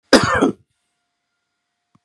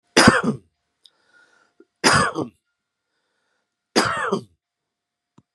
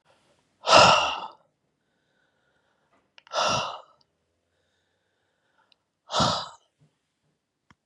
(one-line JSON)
{"cough_length": "2.0 s", "cough_amplitude": 32768, "cough_signal_mean_std_ratio": 0.31, "three_cough_length": "5.5 s", "three_cough_amplitude": 32768, "three_cough_signal_mean_std_ratio": 0.33, "exhalation_length": "7.9 s", "exhalation_amplitude": 26851, "exhalation_signal_mean_std_ratio": 0.27, "survey_phase": "beta (2021-08-13 to 2022-03-07)", "age": "45-64", "gender": "Male", "wearing_mask": "No", "symptom_none": true, "smoker_status": "Never smoked", "respiratory_condition_asthma": false, "respiratory_condition_other": false, "recruitment_source": "REACT", "submission_delay": "2 days", "covid_test_result": "Negative", "covid_test_method": "RT-qPCR", "influenza_a_test_result": "Negative", "influenza_b_test_result": "Negative"}